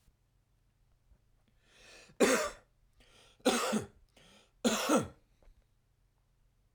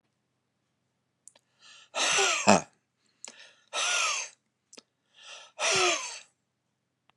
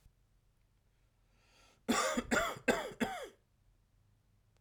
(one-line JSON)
{"three_cough_length": "6.7 s", "three_cough_amplitude": 7529, "three_cough_signal_mean_std_ratio": 0.33, "exhalation_length": "7.2 s", "exhalation_amplitude": 28044, "exhalation_signal_mean_std_ratio": 0.37, "cough_length": "4.6 s", "cough_amplitude": 4475, "cough_signal_mean_std_ratio": 0.38, "survey_phase": "beta (2021-08-13 to 2022-03-07)", "age": "45-64", "gender": "Male", "wearing_mask": "No", "symptom_abdominal_pain": true, "symptom_fatigue": true, "smoker_status": "Never smoked", "respiratory_condition_asthma": false, "respiratory_condition_other": false, "recruitment_source": "REACT", "submission_delay": "1 day", "covid_test_result": "Negative", "covid_test_method": "RT-qPCR"}